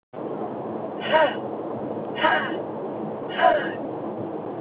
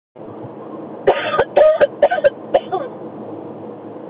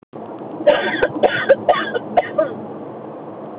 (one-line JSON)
{"exhalation_length": "4.6 s", "exhalation_amplitude": 17409, "exhalation_signal_mean_std_ratio": 0.79, "three_cough_length": "4.1 s", "three_cough_amplitude": 28145, "three_cough_signal_mean_std_ratio": 0.52, "cough_length": "3.6 s", "cough_amplitude": 27970, "cough_signal_mean_std_ratio": 0.6, "survey_phase": "alpha (2021-03-01 to 2021-08-12)", "age": "18-44", "gender": "Female", "wearing_mask": "No", "symptom_none": true, "smoker_status": "Never smoked", "respiratory_condition_asthma": false, "respiratory_condition_other": false, "recruitment_source": "REACT", "submission_delay": "2 days", "covid_test_result": "Negative", "covid_test_method": "RT-qPCR"}